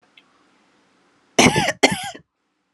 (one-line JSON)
{"cough_length": "2.7 s", "cough_amplitude": 32767, "cough_signal_mean_std_ratio": 0.32, "survey_phase": "alpha (2021-03-01 to 2021-08-12)", "age": "18-44", "gender": "Female", "wearing_mask": "No", "symptom_none": true, "smoker_status": "Never smoked", "respiratory_condition_asthma": false, "respiratory_condition_other": false, "recruitment_source": "REACT", "submission_delay": "2 days", "covid_test_result": "Negative", "covid_test_method": "RT-qPCR"}